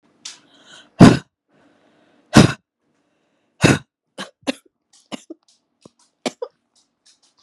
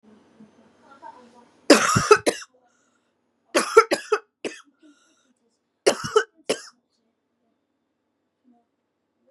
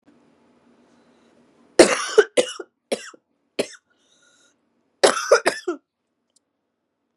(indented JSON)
{
  "exhalation_length": "7.4 s",
  "exhalation_amplitude": 32768,
  "exhalation_signal_mean_std_ratio": 0.2,
  "three_cough_length": "9.3 s",
  "three_cough_amplitude": 32744,
  "three_cough_signal_mean_std_ratio": 0.25,
  "cough_length": "7.2 s",
  "cough_amplitude": 32768,
  "cough_signal_mean_std_ratio": 0.25,
  "survey_phase": "beta (2021-08-13 to 2022-03-07)",
  "age": "18-44",
  "gender": "Female",
  "wearing_mask": "No",
  "symptom_cough_any": true,
  "symptom_new_continuous_cough": true,
  "symptom_runny_or_blocked_nose": true,
  "symptom_sore_throat": true,
  "symptom_onset": "3 days",
  "smoker_status": "Never smoked",
  "respiratory_condition_asthma": false,
  "respiratory_condition_other": false,
  "recruitment_source": "REACT",
  "submission_delay": "2 days",
  "covid_test_result": "Negative",
  "covid_test_method": "RT-qPCR",
  "influenza_a_test_result": "Negative",
  "influenza_b_test_result": "Negative"
}